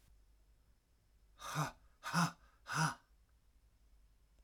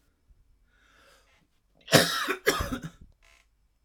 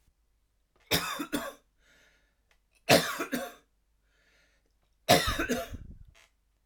exhalation_length: 4.4 s
exhalation_amplitude: 2669
exhalation_signal_mean_std_ratio: 0.35
cough_length: 3.8 s
cough_amplitude: 23921
cough_signal_mean_std_ratio: 0.31
three_cough_length: 6.7 s
three_cough_amplitude: 17194
three_cough_signal_mean_std_ratio: 0.33
survey_phase: alpha (2021-03-01 to 2021-08-12)
age: 45-64
gender: Male
wearing_mask: 'No'
symptom_cough_any: true
symptom_headache: true
smoker_status: Never smoked
respiratory_condition_asthma: false
respiratory_condition_other: false
recruitment_source: Test and Trace
submission_delay: 2 days
covid_test_result: Positive
covid_test_method: RT-qPCR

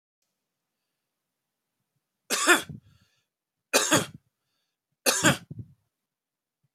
three_cough_length: 6.7 s
three_cough_amplitude: 22223
three_cough_signal_mean_std_ratio: 0.27
survey_phase: alpha (2021-03-01 to 2021-08-12)
age: 65+
gender: Male
wearing_mask: 'No'
symptom_none: true
smoker_status: Never smoked
respiratory_condition_asthma: false
respiratory_condition_other: false
recruitment_source: REACT
submission_delay: 2 days
covid_test_result: Negative
covid_test_method: RT-qPCR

